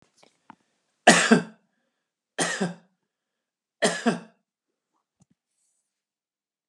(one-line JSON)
{"cough_length": "6.7 s", "cough_amplitude": 29620, "cough_signal_mean_std_ratio": 0.25, "survey_phase": "alpha (2021-03-01 to 2021-08-12)", "age": "65+", "gender": "Male", "wearing_mask": "No", "symptom_none": true, "smoker_status": "Never smoked", "respiratory_condition_asthma": false, "respiratory_condition_other": false, "recruitment_source": "REACT", "submission_delay": "2 days", "covid_test_result": "Negative", "covid_test_method": "RT-qPCR"}